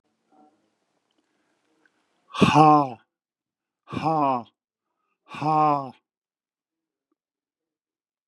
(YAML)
exhalation_length: 8.3 s
exhalation_amplitude: 26725
exhalation_signal_mean_std_ratio: 0.3
survey_phase: beta (2021-08-13 to 2022-03-07)
age: 65+
gender: Male
wearing_mask: 'No'
symptom_none: true
smoker_status: Never smoked
respiratory_condition_asthma: false
respiratory_condition_other: false
recruitment_source: REACT
submission_delay: 3 days
covid_test_result: Negative
covid_test_method: RT-qPCR
influenza_a_test_result: Negative
influenza_b_test_result: Negative